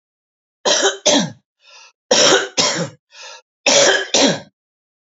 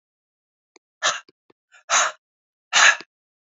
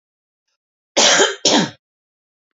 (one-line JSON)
{"three_cough_length": "5.1 s", "three_cough_amplitude": 32767, "three_cough_signal_mean_std_ratio": 0.5, "exhalation_length": "3.5 s", "exhalation_amplitude": 26699, "exhalation_signal_mean_std_ratio": 0.3, "cough_length": "2.6 s", "cough_amplitude": 32585, "cough_signal_mean_std_ratio": 0.39, "survey_phase": "beta (2021-08-13 to 2022-03-07)", "age": "65+", "gender": "Male", "wearing_mask": "No", "symptom_cough_any": true, "symptom_fatigue": true, "smoker_status": "Never smoked", "respiratory_condition_asthma": false, "respiratory_condition_other": false, "recruitment_source": "Test and Trace", "submission_delay": "2 days", "covid_test_result": "Positive", "covid_test_method": "RT-qPCR"}